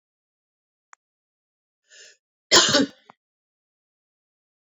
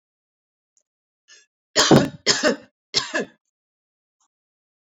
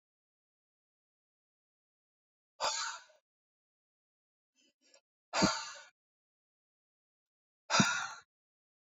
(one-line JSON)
{"cough_length": "4.8 s", "cough_amplitude": 27127, "cough_signal_mean_std_ratio": 0.21, "three_cough_length": "4.9 s", "three_cough_amplitude": 27892, "three_cough_signal_mean_std_ratio": 0.29, "exhalation_length": "8.9 s", "exhalation_amplitude": 7638, "exhalation_signal_mean_std_ratio": 0.25, "survey_phase": "beta (2021-08-13 to 2022-03-07)", "age": "45-64", "gender": "Female", "wearing_mask": "No", "symptom_none": true, "smoker_status": "Never smoked", "respiratory_condition_asthma": false, "respiratory_condition_other": false, "recruitment_source": "REACT", "submission_delay": "3 days", "covid_test_result": "Negative", "covid_test_method": "RT-qPCR"}